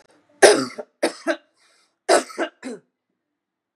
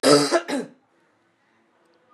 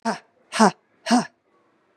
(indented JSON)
{
  "three_cough_length": "3.8 s",
  "three_cough_amplitude": 32768,
  "three_cough_signal_mean_std_ratio": 0.3,
  "cough_length": "2.1 s",
  "cough_amplitude": 25259,
  "cough_signal_mean_std_ratio": 0.37,
  "exhalation_length": "2.0 s",
  "exhalation_amplitude": 29155,
  "exhalation_signal_mean_std_ratio": 0.34,
  "survey_phase": "beta (2021-08-13 to 2022-03-07)",
  "age": "45-64",
  "gender": "Female",
  "wearing_mask": "Yes",
  "symptom_cough_any": true,
  "symptom_new_continuous_cough": true,
  "symptom_runny_or_blocked_nose": true,
  "symptom_shortness_of_breath": true,
  "symptom_sore_throat": true,
  "symptom_fatigue": true,
  "symptom_headache": true,
  "symptom_change_to_sense_of_smell_or_taste": true,
  "symptom_loss_of_taste": true,
  "symptom_onset": "2 days",
  "smoker_status": "Never smoked",
  "respiratory_condition_asthma": false,
  "respiratory_condition_other": false,
  "recruitment_source": "Test and Trace",
  "submission_delay": "1 day",
  "covid_test_result": "Negative",
  "covid_test_method": "RT-qPCR"
}